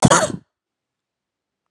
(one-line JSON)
{"cough_length": "1.7 s", "cough_amplitude": 31819, "cough_signal_mean_std_ratio": 0.29, "survey_phase": "beta (2021-08-13 to 2022-03-07)", "age": "18-44", "gender": "Female", "wearing_mask": "No", "symptom_cough_any": true, "symptom_runny_or_blocked_nose": true, "symptom_sore_throat": true, "smoker_status": "Ex-smoker", "respiratory_condition_asthma": false, "respiratory_condition_other": false, "recruitment_source": "Test and Trace", "submission_delay": "2 days", "covid_test_result": "Positive", "covid_test_method": "RT-qPCR"}